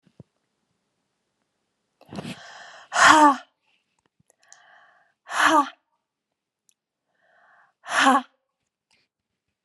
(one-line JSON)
{"exhalation_length": "9.6 s", "exhalation_amplitude": 28917, "exhalation_signal_mean_std_ratio": 0.27, "survey_phase": "beta (2021-08-13 to 2022-03-07)", "age": "45-64", "gender": "Female", "wearing_mask": "No", "symptom_none": true, "smoker_status": "Never smoked", "respiratory_condition_asthma": false, "respiratory_condition_other": false, "recruitment_source": "REACT", "submission_delay": "1 day", "covid_test_result": "Negative", "covid_test_method": "RT-qPCR"}